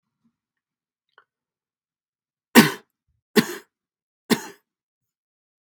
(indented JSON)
{
  "three_cough_length": "5.7 s",
  "three_cough_amplitude": 32768,
  "three_cough_signal_mean_std_ratio": 0.17,
  "survey_phase": "beta (2021-08-13 to 2022-03-07)",
  "age": "45-64",
  "gender": "Male",
  "wearing_mask": "No",
  "symptom_cough_any": true,
  "symptom_diarrhoea": true,
  "symptom_headache": true,
  "symptom_onset": "2 days",
  "smoker_status": "Ex-smoker",
  "respiratory_condition_asthma": false,
  "respiratory_condition_other": false,
  "recruitment_source": "Test and Trace",
  "submission_delay": "1 day",
  "covid_test_result": "Positive",
  "covid_test_method": "RT-qPCR",
  "covid_ct_value": 15.9,
  "covid_ct_gene": "ORF1ab gene"
}